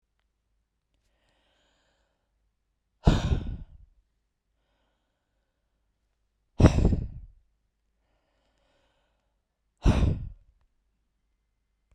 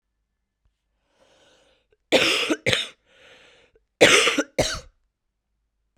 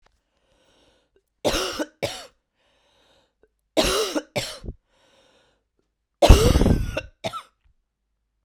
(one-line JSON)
{"exhalation_length": "11.9 s", "exhalation_amplitude": 23020, "exhalation_signal_mean_std_ratio": 0.23, "cough_length": "6.0 s", "cough_amplitude": 32767, "cough_signal_mean_std_ratio": 0.33, "three_cough_length": "8.4 s", "three_cough_amplitude": 32768, "three_cough_signal_mean_std_ratio": 0.31, "survey_phase": "beta (2021-08-13 to 2022-03-07)", "age": "18-44", "gender": "Female", "wearing_mask": "No", "symptom_new_continuous_cough": true, "symptom_headache": true, "symptom_onset": "7 days", "smoker_status": "Current smoker (e-cigarettes or vapes only)", "respiratory_condition_asthma": false, "respiratory_condition_other": false, "recruitment_source": "REACT", "submission_delay": "2 days", "covid_test_result": "Negative", "covid_test_method": "RT-qPCR", "influenza_a_test_result": "Negative", "influenza_b_test_result": "Negative"}